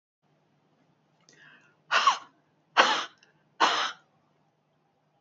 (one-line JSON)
{"exhalation_length": "5.2 s", "exhalation_amplitude": 19790, "exhalation_signal_mean_std_ratio": 0.3, "survey_phase": "beta (2021-08-13 to 2022-03-07)", "age": "65+", "gender": "Female", "wearing_mask": "No", "symptom_none": true, "smoker_status": "Never smoked", "respiratory_condition_asthma": false, "respiratory_condition_other": false, "recruitment_source": "REACT", "submission_delay": "1 day", "covid_test_result": "Negative", "covid_test_method": "RT-qPCR", "influenza_a_test_result": "Negative", "influenza_b_test_result": "Negative"}